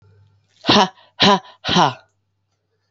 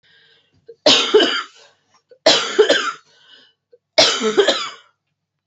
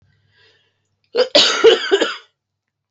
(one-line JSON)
{"exhalation_length": "2.9 s", "exhalation_amplitude": 30064, "exhalation_signal_mean_std_ratio": 0.37, "three_cough_length": "5.5 s", "three_cough_amplitude": 32767, "three_cough_signal_mean_std_ratio": 0.45, "cough_length": "2.9 s", "cough_amplitude": 31762, "cough_signal_mean_std_ratio": 0.41, "survey_phase": "beta (2021-08-13 to 2022-03-07)", "age": "18-44", "gender": "Female", "wearing_mask": "No", "symptom_cough_any": true, "symptom_runny_or_blocked_nose": true, "symptom_shortness_of_breath": true, "symptom_fatigue": true, "symptom_change_to_sense_of_smell_or_taste": true, "smoker_status": "Current smoker (1 to 10 cigarettes per day)", "respiratory_condition_asthma": false, "respiratory_condition_other": false, "recruitment_source": "Test and Trace", "submission_delay": "2 days", "covid_test_result": "Positive", "covid_test_method": "ePCR"}